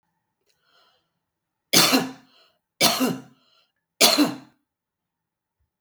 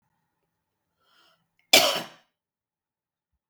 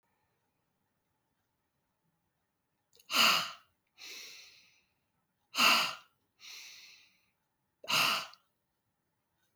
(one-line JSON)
{"three_cough_length": "5.8 s", "three_cough_amplitude": 31480, "three_cough_signal_mean_std_ratio": 0.32, "cough_length": "3.5 s", "cough_amplitude": 32766, "cough_signal_mean_std_ratio": 0.19, "exhalation_length": "9.6 s", "exhalation_amplitude": 7716, "exhalation_signal_mean_std_ratio": 0.28, "survey_phase": "beta (2021-08-13 to 2022-03-07)", "age": "45-64", "gender": "Female", "wearing_mask": "No", "symptom_cough_any": true, "symptom_runny_or_blocked_nose": true, "symptom_sore_throat": true, "smoker_status": "Ex-smoker", "respiratory_condition_asthma": false, "respiratory_condition_other": false, "recruitment_source": "REACT", "submission_delay": "3 days", "covid_test_result": "Negative", "covid_test_method": "RT-qPCR", "influenza_a_test_result": "Unknown/Void", "influenza_b_test_result": "Unknown/Void"}